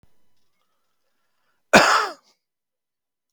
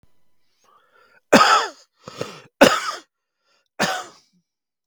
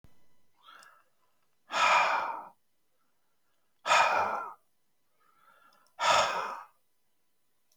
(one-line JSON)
{"cough_length": "3.3 s", "cough_amplitude": 32768, "cough_signal_mean_std_ratio": 0.24, "three_cough_length": "4.9 s", "three_cough_amplitude": 32768, "three_cough_signal_mean_std_ratio": 0.31, "exhalation_length": "7.8 s", "exhalation_amplitude": 9470, "exhalation_signal_mean_std_ratio": 0.39, "survey_phase": "beta (2021-08-13 to 2022-03-07)", "age": "45-64", "gender": "Male", "wearing_mask": "No", "symptom_none": true, "smoker_status": "Current smoker (11 or more cigarettes per day)", "respiratory_condition_asthma": false, "respiratory_condition_other": false, "recruitment_source": "REACT", "submission_delay": "2 days", "covid_test_result": "Negative", "covid_test_method": "RT-qPCR"}